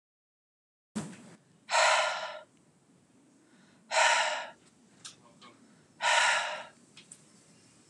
exhalation_length: 7.9 s
exhalation_amplitude: 10437
exhalation_signal_mean_std_ratio: 0.4
survey_phase: beta (2021-08-13 to 2022-03-07)
age: 45-64
gender: Male
wearing_mask: 'No'
symptom_none: true
smoker_status: Never smoked
respiratory_condition_asthma: false
respiratory_condition_other: false
recruitment_source: REACT
submission_delay: 2 days
covid_test_result: Negative
covid_test_method: RT-qPCR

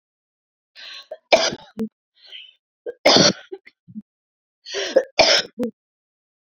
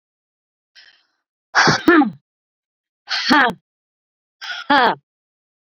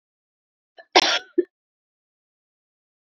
three_cough_length: 6.6 s
three_cough_amplitude: 29050
three_cough_signal_mean_std_ratio: 0.33
exhalation_length: 5.6 s
exhalation_amplitude: 29730
exhalation_signal_mean_std_ratio: 0.36
cough_length: 3.1 s
cough_amplitude: 28429
cough_signal_mean_std_ratio: 0.21
survey_phase: beta (2021-08-13 to 2022-03-07)
age: 18-44
gender: Female
wearing_mask: 'No'
symptom_cough_any: true
symptom_runny_or_blocked_nose: true
symptom_abdominal_pain: true
symptom_diarrhoea: true
symptom_fatigue: true
symptom_headache: true
symptom_change_to_sense_of_smell_or_taste: true
symptom_loss_of_taste: true
smoker_status: Current smoker (e-cigarettes or vapes only)
respiratory_condition_asthma: true
respiratory_condition_other: false
recruitment_source: Test and Trace
submission_delay: 2 days
covid_test_result: Positive
covid_test_method: RT-qPCR
covid_ct_value: 31.9
covid_ct_gene: N gene
covid_ct_mean: 32.5
covid_viral_load: 23 copies/ml
covid_viral_load_category: Minimal viral load (< 10K copies/ml)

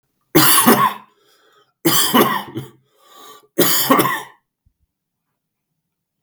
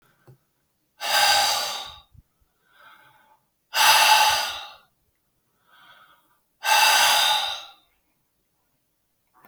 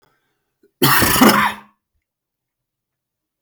three_cough_length: 6.2 s
three_cough_amplitude: 32768
three_cough_signal_mean_std_ratio: 0.44
exhalation_length: 9.5 s
exhalation_amplitude: 23924
exhalation_signal_mean_std_ratio: 0.42
cough_length: 3.4 s
cough_amplitude: 32766
cough_signal_mean_std_ratio: 0.37
survey_phase: beta (2021-08-13 to 2022-03-07)
age: 45-64
gender: Male
wearing_mask: 'No'
symptom_runny_or_blocked_nose: true
symptom_sore_throat: true
symptom_onset: 5 days
smoker_status: Never smoked
respiratory_condition_asthma: false
respiratory_condition_other: false
recruitment_source: Test and Trace
submission_delay: 2 days
covid_test_result: Positive
covid_test_method: ePCR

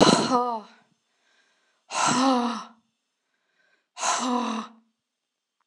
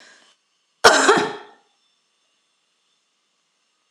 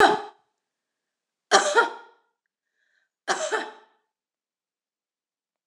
exhalation_length: 5.7 s
exhalation_amplitude: 24123
exhalation_signal_mean_std_ratio: 0.44
cough_length: 3.9 s
cough_amplitude: 26028
cough_signal_mean_std_ratio: 0.26
three_cough_length: 5.7 s
three_cough_amplitude: 24193
three_cough_signal_mean_std_ratio: 0.28
survey_phase: beta (2021-08-13 to 2022-03-07)
age: 45-64
gender: Female
wearing_mask: 'No'
symptom_none: true
smoker_status: Current smoker (1 to 10 cigarettes per day)
respiratory_condition_asthma: false
respiratory_condition_other: false
recruitment_source: REACT
submission_delay: 1 day
covid_test_result: Negative
covid_test_method: RT-qPCR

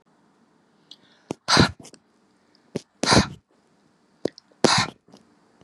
exhalation_length: 5.6 s
exhalation_amplitude: 29594
exhalation_signal_mean_std_ratio: 0.28
survey_phase: beta (2021-08-13 to 2022-03-07)
age: 45-64
gender: Female
wearing_mask: 'No'
symptom_none: true
smoker_status: Never smoked
respiratory_condition_asthma: false
respiratory_condition_other: false
recruitment_source: REACT
submission_delay: 3 days
covid_test_result: Negative
covid_test_method: RT-qPCR
influenza_a_test_result: Negative
influenza_b_test_result: Negative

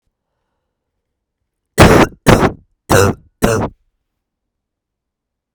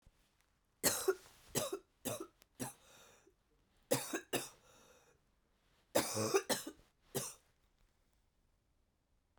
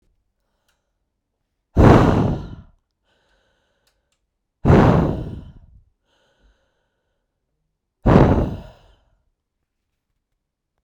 cough_length: 5.5 s
cough_amplitude: 32768
cough_signal_mean_std_ratio: 0.33
three_cough_length: 9.4 s
three_cough_amplitude: 4672
three_cough_signal_mean_std_ratio: 0.34
exhalation_length: 10.8 s
exhalation_amplitude: 32768
exhalation_signal_mean_std_ratio: 0.31
survey_phase: beta (2021-08-13 to 2022-03-07)
age: 45-64
gender: Female
wearing_mask: 'No'
symptom_cough_any: true
symptom_runny_or_blocked_nose: true
symptom_shortness_of_breath: true
symptom_sore_throat: true
symptom_fatigue: true
symptom_fever_high_temperature: true
smoker_status: Never smoked
respiratory_condition_asthma: false
respiratory_condition_other: false
recruitment_source: Test and Trace
submission_delay: 2 days
covid_test_result: Positive
covid_test_method: LFT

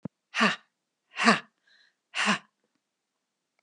exhalation_length: 3.6 s
exhalation_amplitude: 19672
exhalation_signal_mean_std_ratio: 0.31
survey_phase: beta (2021-08-13 to 2022-03-07)
age: 65+
gender: Female
wearing_mask: 'No'
symptom_none: true
smoker_status: Never smoked
respiratory_condition_asthma: false
respiratory_condition_other: false
recruitment_source: REACT
submission_delay: 1 day
covid_test_result: Negative
covid_test_method: RT-qPCR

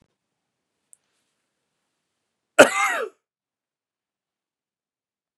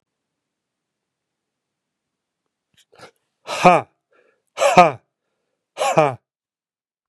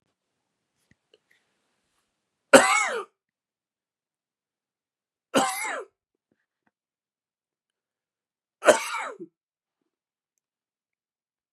cough_length: 5.4 s
cough_amplitude: 32767
cough_signal_mean_std_ratio: 0.16
exhalation_length: 7.1 s
exhalation_amplitude: 32768
exhalation_signal_mean_std_ratio: 0.24
three_cough_length: 11.5 s
three_cough_amplitude: 31922
three_cough_signal_mean_std_ratio: 0.2
survey_phase: beta (2021-08-13 to 2022-03-07)
age: 45-64
gender: Male
wearing_mask: 'No'
symptom_runny_or_blocked_nose: true
symptom_fatigue: true
symptom_fever_high_temperature: true
symptom_change_to_sense_of_smell_or_taste: true
symptom_onset: 3 days
smoker_status: Never smoked
respiratory_condition_asthma: false
respiratory_condition_other: false
recruitment_source: Test and Trace
submission_delay: 2 days
covid_test_result: Positive
covid_test_method: RT-qPCR
covid_ct_value: 15.7
covid_ct_gene: ORF1ab gene
covid_ct_mean: 16.1
covid_viral_load: 5400000 copies/ml
covid_viral_load_category: High viral load (>1M copies/ml)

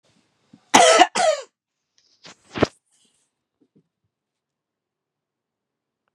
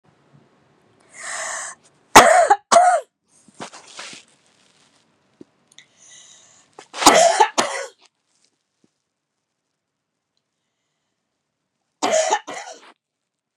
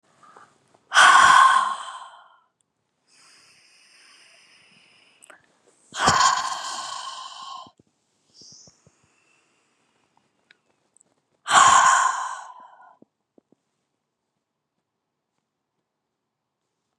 cough_length: 6.1 s
cough_amplitude: 32768
cough_signal_mean_std_ratio: 0.24
three_cough_length: 13.6 s
three_cough_amplitude: 32768
three_cough_signal_mean_std_ratio: 0.29
exhalation_length: 17.0 s
exhalation_amplitude: 27567
exhalation_signal_mean_std_ratio: 0.3
survey_phase: beta (2021-08-13 to 2022-03-07)
age: 45-64
gender: Female
wearing_mask: 'No'
symptom_none: true
smoker_status: Never smoked
respiratory_condition_asthma: false
respiratory_condition_other: false
recruitment_source: REACT
submission_delay: 12 days
covid_test_result: Negative
covid_test_method: RT-qPCR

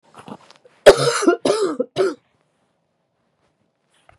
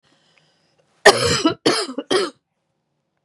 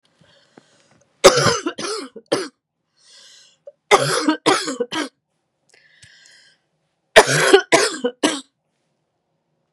exhalation_length: 4.2 s
exhalation_amplitude: 32768
exhalation_signal_mean_std_ratio: 0.33
cough_length: 3.2 s
cough_amplitude: 32768
cough_signal_mean_std_ratio: 0.37
three_cough_length: 9.7 s
three_cough_amplitude: 32768
three_cough_signal_mean_std_ratio: 0.35
survey_phase: beta (2021-08-13 to 2022-03-07)
age: 45-64
gender: Female
wearing_mask: 'No'
symptom_cough_any: true
symptom_runny_or_blocked_nose: true
symptom_headache: true
symptom_change_to_sense_of_smell_or_taste: true
symptom_loss_of_taste: true
symptom_onset: 3 days
smoker_status: Never smoked
respiratory_condition_asthma: false
respiratory_condition_other: false
recruitment_source: Test and Trace
submission_delay: 2 days
covid_test_result: Positive
covid_test_method: RT-qPCR
covid_ct_value: 15.9
covid_ct_gene: ORF1ab gene
covid_ct_mean: 16.2
covid_viral_load: 4900000 copies/ml
covid_viral_load_category: High viral load (>1M copies/ml)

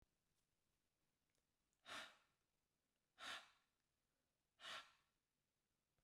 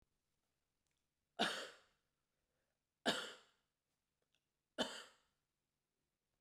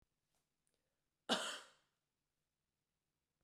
exhalation_length: 6.0 s
exhalation_amplitude: 296
exhalation_signal_mean_std_ratio: 0.31
three_cough_length: 6.4 s
three_cough_amplitude: 2337
three_cough_signal_mean_std_ratio: 0.24
cough_length: 3.4 s
cough_amplitude: 2691
cough_signal_mean_std_ratio: 0.21
survey_phase: beta (2021-08-13 to 2022-03-07)
age: 45-64
gender: Female
wearing_mask: 'No'
symptom_none: true
smoker_status: Never smoked
respiratory_condition_asthma: false
respiratory_condition_other: false
recruitment_source: REACT
submission_delay: 1 day
covid_test_result: Negative
covid_test_method: RT-qPCR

